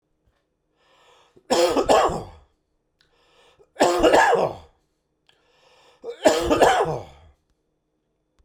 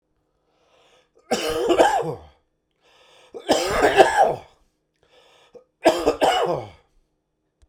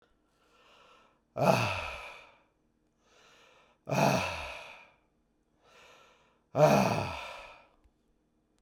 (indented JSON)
{
  "cough_length": "8.4 s",
  "cough_amplitude": 28794,
  "cough_signal_mean_std_ratio": 0.41,
  "three_cough_length": "7.7 s",
  "three_cough_amplitude": 32768,
  "three_cough_signal_mean_std_ratio": 0.43,
  "exhalation_length": "8.6 s",
  "exhalation_amplitude": 13155,
  "exhalation_signal_mean_std_ratio": 0.35,
  "survey_phase": "beta (2021-08-13 to 2022-03-07)",
  "age": "45-64",
  "gender": "Male",
  "wearing_mask": "No",
  "symptom_cough_any": true,
  "symptom_change_to_sense_of_smell_or_taste": true,
  "smoker_status": "Never smoked",
  "respiratory_condition_asthma": false,
  "respiratory_condition_other": false,
  "recruitment_source": "REACT",
  "submission_delay": "2 days",
  "covid_test_result": "Negative",
  "covid_test_method": "RT-qPCR",
  "influenza_a_test_result": "Unknown/Void",
  "influenza_b_test_result": "Unknown/Void"
}